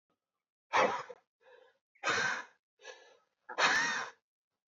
{"exhalation_length": "4.7 s", "exhalation_amplitude": 6387, "exhalation_signal_mean_std_ratio": 0.41, "survey_phase": "alpha (2021-03-01 to 2021-08-12)", "age": "18-44", "gender": "Male", "wearing_mask": "No", "symptom_cough_any": true, "symptom_new_continuous_cough": true, "symptom_abdominal_pain": true, "symptom_fatigue": true, "symptom_fever_high_temperature": true, "symptom_onset": "3 days", "smoker_status": "Never smoked", "respiratory_condition_asthma": false, "respiratory_condition_other": false, "recruitment_source": "Test and Trace", "submission_delay": "2 days", "covid_test_result": "Positive", "covid_test_method": "RT-qPCR", "covid_ct_value": 19.3, "covid_ct_gene": "ORF1ab gene", "covid_ct_mean": 20.4, "covid_viral_load": "210000 copies/ml", "covid_viral_load_category": "Low viral load (10K-1M copies/ml)"}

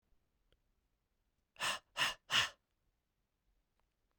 {"exhalation_length": "4.2 s", "exhalation_amplitude": 3800, "exhalation_signal_mean_std_ratio": 0.27, "survey_phase": "beta (2021-08-13 to 2022-03-07)", "age": "18-44", "gender": "Male", "wearing_mask": "No", "symptom_cough_any": true, "symptom_runny_or_blocked_nose": true, "symptom_fatigue": true, "symptom_headache": true, "symptom_change_to_sense_of_smell_or_taste": true, "symptom_onset": "5 days", "smoker_status": "Never smoked", "respiratory_condition_asthma": false, "respiratory_condition_other": false, "recruitment_source": "Test and Trace", "submission_delay": "1 day", "covid_test_result": "Positive", "covid_test_method": "RT-qPCR", "covid_ct_value": 19.6, "covid_ct_gene": "ORF1ab gene"}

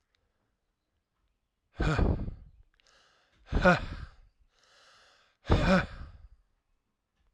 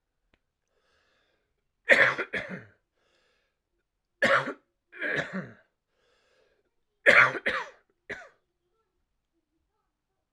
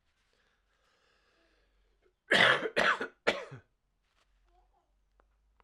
{"exhalation_length": "7.3 s", "exhalation_amplitude": 12227, "exhalation_signal_mean_std_ratio": 0.34, "three_cough_length": "10.3 s", "three_cough_amplitude": 23765, "three_cough_signal_mean_std_ratio": 0.27, "cough_length": "5.6 s", "cough_amplitude": 13739, "cough_signal_mean_std_ratio": 0.28, "survey_phase": "alpha (2021-03-01 to 2021-08-12)", "age": "18-44", "gender": "Male", "wearing_mask": "No", "symptom_cough_any": true, "symptom_fatigue": true, "symptom_fever_high_temperature": true, "smoker_status": "Never smoked", "respiratory_condition_asthma": true, "respiratory_condition_other": false, "recruitment_source": "Test and Trace", "submission_delay": "2 days", "covid_test_result": "Positive", "covid_test_method": "RT-qPCR"}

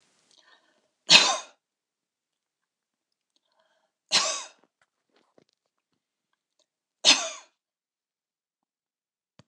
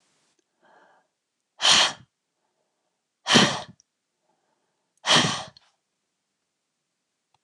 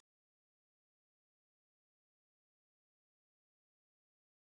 {"three_cough_length": "9.5 s", "three_cough_amplitude": 29202, "three_cough_signal_mean_std_ratio": 0.19, "exhalation_length": "7.4 s", "exhalation_amplitude": 24723, "exhalation_signal_mean_std_ratio": 0.27, "cough_length": "4.5 s", "cough_amplitude": 28, "cough_signal_mean_std_ratio": 0.02, "survey_phase": "beta (2021-08-13 to 2022-03-07)", "age": "45-64", "gender": "Female", "wearing_mask": "No", "symptom_cough_any": true, "symptom_runny_or_blocked_nose": true, "smoker_status": "Never smoked", "respiratory_condition_asthma": false, "respiratory_condition_other": false, "recruitment_source": "REACT", "submission_delay": "2 days", "covid_test_result": "Negative", "covid_test_method": "RT-qPCR"}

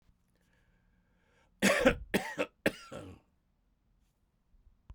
{"three_cough_length": "4.9 s", "three_cough_amplitude": 9824, "three_cough_signal_mean_std_ratio": 0.29, "survey_phase": "beta (2021-08-13 to 2022-03-07)", "age": "45-64", "gender": "Male", "wearing_mask": "No", "symptom_cough_any": true, "symptom_runny_or_blocked_nose": true, "symptom_sore_throat": true, "symptom_fatigue": true, "symptom_headache": true, "symptom_change_to_sense_of_smell_or_taste": true, "symptom_loss_of_taste": true, "symptom_onset": "6 days", "smoker_status": "Ex-smoker", "respiratory_condition_asthma": false, "respiratory_condition_other": false, "recruitment_source": "Test and Trace", "submission_delay": "1 day", "covid_test_result": "Positive", "covid_test_method": "ePCR"}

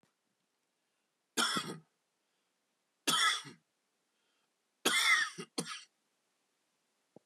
{"three_cough_length": "7.3 s", "three_cough_amplitude": 6385, "three_cough_signal_mean_std_ratio": 0.33, "survey_phase": "beta (2021-08-13 to 2022-03-07)", "age": "45-64", "gender": "Male", "wearing_mask": "No", "symptom_cough_any": true, "symptom_runny_or_blocked_nose": true, "symptom_sore_throat": true, "smoker_status": "Never smoked", "respiratory_condition_asthma": false, "respiratory_condition_other": false, "recruitment_source": "Test and Trace", "submission_delay": "0 days", "covid_test_result": "Positive", "covid_test_method": "LFT"}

